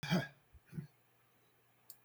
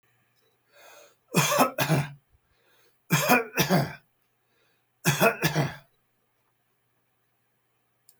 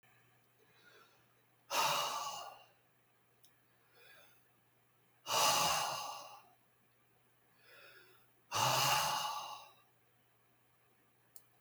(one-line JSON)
{"cough_length": "2.0 s", "cough_amplitude": 2611, "cough_signal_mean_std_ratio": 0.33, "three_cough_length": "8.2 s", "three_cough_amplitude": 17220, "three_cough_signal_mean_std_ratio": 0.38, "exhalation_length": "11.6 s", "exhalation_amplitude": 3752, "exhalation_signal_mean_std_ratio": 0.41, "survey_phase": "beta (2021-08-13 to 2022-03-07)", "age": "65+", "gender": "Male", "wearing_mask": "No", "symptom_none": true, "smoker_status": "Ex-smoker", "respiratory_condition_asthma": false, "respiratory_condition_other": false, "recruitment_source": "REACT", "submission_delay": "2 days", "covid_test_result": "Negative", "covid_test_method": "RT-qPCR", "influenza_a_test_result": "Negative", "influenza_b_test_result": "Negative"}